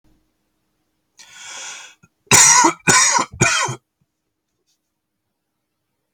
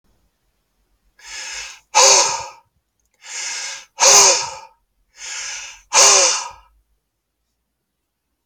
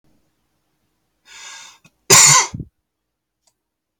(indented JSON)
{
  "three_cough_length": "6.1 s",
  "three_cough_amplitude": 32768,
  "three_cough_signal_mean_std_ratio": 0.35,
  "exhalation_length": "8.5 s",
  "exhalation_amplitude": 32768,
  "exhalation_signal_mean_std_ratio": 0.38,
  "cough_length": "4.0 s",
  "cough_amplitude": 32768,
  "cough_signal_mean_std_ratio": 0.26,
  "survey_phase": "alpha (2021-03-01 to 2021-08-12)",
  "age": "18-44",
  "gender": "Male",
  "wearing_mask": "No",
  "symptom_cough_any": true,
  "symptom_fatigue": true,
  "symptom_onset": "3 days",
  "smoker_status": "Never smoked",
  "respiratory_condition_asthma": false,
  "respiratory_condition_other": false,
  "recruitment_source": "REACT",
  "submission_delay": "1 day",
  "covid_test_result": "Negative",
  "covid_test_method": "RT-qPCR"
}